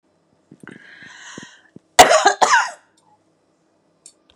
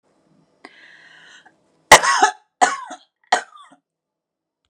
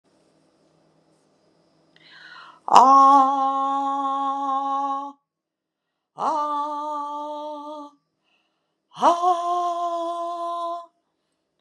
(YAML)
cough_length: 4.4 s
cough_amplitude: 32768
cough_signal_mean_std_ratio: 0.29
three_cough_length: 4.7 s
three_cough_amplitude: 32768
three_cough_signal_mean_std_ratio: 0.25
exhalation_length: 11.6 s
exhalation_amplitude: 32768
exhalation_signal_mean_std_ratio: 0.51
survey_phase: beta (2021-08-13 to 2022-03-07)
age: 45-64
gender: Female
wearing_mask: 'No'
symptom_none: true
smoker_status: Never smoked
respiratory_condition_asthma: false
respiratory_condition_other: false
recruitment_source: REACT
submission_delay: 2 days
covid_test_result: Negative
covid_test_method: RT-qPCR
influenza_a_test_result: Negative
influenza_b_test_result: Negative